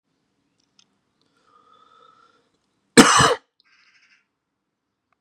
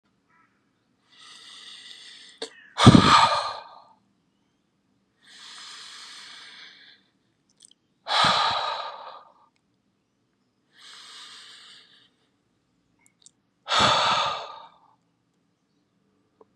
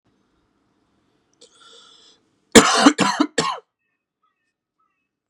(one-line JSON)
{"cough_length": "5.2 s", "cough_amplitude": 32768, "cough_signal_mean_std_ratio": 0.2, "exhalation_length": "16.6 s", "exhalation_amplitude": 32768, "exhalation_signal_mean_std_ratio": 0.28, "three_cough_length": "5.3 s", "three_cough_amplitude": 32768, "three_cough_signal_mean_std_ratio": 0.26, "survey_phase": "beta (2021-08-13 to 2022-03-07)", "age": "18-44", "gender": "Male", "wearing_mask": "No", "symptom_cough_any": true, "symptom_runny_or_blocked_nose": true, "symptom_fatigue": true, "symptom_fever_high_temperature": true, "symptom_headache": true, "smoker_status": "Ex-smoker", "respiratory_condition_asthma": false, "respiratory_condition_other": false, "recruitment_source": "Test and Trace", "submission_delay": "1 day", "covid_test_result": "Positive", "covid_test_method": "LFT"}